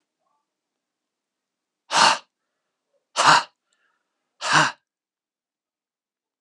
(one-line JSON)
{"exhalation_length": "6.4 s", "exhalation_amplitude": 29635, "exhalation_signal_mean_std_ratio": 0.26, "survey_phase": "alpha (2021-03-01 to 2021-08-12)", "age": "45-64", "gender": "Male", "wearing_mask": "No", "symptom_none": true, "smoker_status": "Current smoker (e-cigarettes or vapes only)", "respiratory_condition_asthma": false, "respiratory_condition_other": false, "recruitment_source": "REACT", "submission_delay": "2 days", "covid_test_result": "Negative", "covid_test_method": "RT-qPCR"}